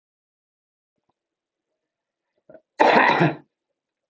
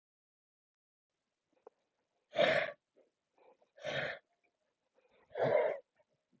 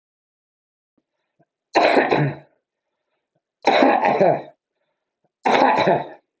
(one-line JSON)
{"cough_length": "4.1 s", "cough_amplitude": 27016, "cough_signal_mean_std_ratio": 0.29, "exhalation_length": "6.4 s", "exhalation_amplitude": 5279, "exhalation_signal_mean_std_ratio": 0.31, "three_cough_length": "6.4 s", "three_cough_amplitude": 29546, "three_cough_signal_mean_std_ratio": 0.45, "survey_phase": "beta (2021-08-13 to 2022-03-07)", "age": "45-64", "gender": "Male", "wearing_mask": "No", "symptom_none": true, "smoker_status": "Current smoker (11 or more cigarettes per day)", "respiratory_condition_asthma": false, "respiratory_condition_other": true, "recruitment_source": "REACT", "submission_delay": "10 days", "covid_test_result": "Negative", "covid_test_method": "RT-qPCR"}